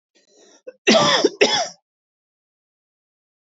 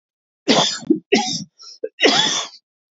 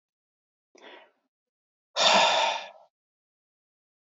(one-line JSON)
{"cough_length": "3.4 s", "cough_amplitude": 26647, "cough_signal_mean_std_ratio": 0.36, "three_cough_length": "2.9 s", "three_cough_amplitude": 27078, "three_cough_signal_mean_std_ratio": 0.51, "exhalation_length": "4.1 s", "exhalation_amplitude": 15160, "exhalation_signal_mean_std_ratio": 0.32, "survey_phase": "beta (2021-08-13 to 2022-03-07)", "age": "45-64", "gender": "Male", "wearing_mask": "No", "symptom_runny_or_blocked_nose": true, "smoker_status": "Never smoked", "respiratory_condition_asthma": false, "respiratory_condition_other": false, "recruitment_source": "REACT", "submission_delay": "2 days", "covid_test_result": "Negative", "covid_test_method": "RT-qPCR", "influenza_a_test_result": "Negative", "influenza_b_test_result": "Negative"}